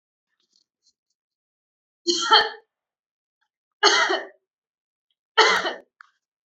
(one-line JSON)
{"three_cough_length": "6.5 s", "three_cough_amplitude": 27218, "three_cough_signal_mean_std_ratio": 0.31, "survey_phase": "beta (2021-08-13 to 2022-03-07)", "age": "18-44", "gender": "Female", "wearing_mask": "No", "symptom_none": true, "smoker_status": "Never smoked", "respiratory_condition_asthma": true, "respiratory_condition_other": false, "recruitment_source": "REACT", "submission_delay": "2 days", "covid_test_result": "Negative", "covid_test_method": "RT-qPCR"}